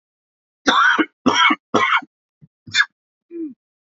{"three_cough_length": "3.9 s", "three_cough_amplitude": 27961, "three_cough_signal_mean_std_ratio": 0.45, "survey_phase": "beta (2021-08-13 to 2022-03-07)", "age": "18-44", "gender": "Male", "wearing_mask": "No", "symptom_cough_any": true, "symptom_new_continuous_cough": true, "symptom_runny_or_blocked_nose": true, "symptom_shortness_of_breath": true, "symptom_sore_throat": true, "symptom_fatigue": true, "symptom_change_to_sense_of_smell_or_taste": true, "symptom_onset": "4 days", "smoker_status": "Never smoked", "respiratory_condition_asthma": false, "respiratory_condition_other": false, "recruitment_source": "Test and Trace", "submission_delay": "2 days", "covid_test_result": "Positive", "covid_test_method": "RT-qPCR"}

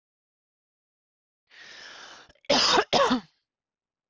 {"cough_length": "4.1 s", "cough_amplitude": 11892, "cough_signal_mean_std_ratio": 0.34, "survey_phase": "beta (2021-08-13 to 2022-03-07)", "age": "18-44", "gender": "Female", "wearing_mask": "No", "symptom_none": true, "symptom_onset": "9 days", "smoker_status": "Ex-smoker", "respiratory_condition_asthma": false, "respiratory_condition_other": false, "recruitment_source": "REACT", "submission_delay": "1 day", "covid_test_result": "Negative", "covid_test_method": "RT-qPCR"}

